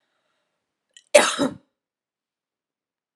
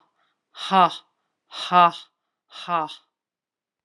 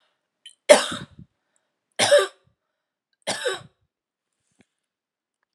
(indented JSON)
{
  "cough_length": "3.2 s",
  "cough_amplitude": 32768,
  "cough_signal_mean_std_ratio": 0.21,
  "exhalation_length": "3.8 s",
  "exhalation_amplitude": 24115,
  "exhalation_signal_mean_std_ratio": 0.3,
  "three_cough_length": "5.5 s",
  "three_cough_amplitude": 32768,
  "three_cough_signal_mean_std_ratio": 0.24,
  "survey_phase": "alpha (2021-03-01 to 2021-08-12)",
  "age": "45-64",
  "gender": "Female",
  "wearing_mask": "No",
  "symptom_none": true,
  "symptom_onset": "2 days",
  "smoker_status": "Prefer not to say",
  "respiratory_condition_asthma": false,
  "respiratory_condition_other": false,
  "recruitment_source": "REACT",
  "submission_delay": "2 days",
  "covid_test_result": "Negative",
  "covid_test_method": "RT-qPCR"
}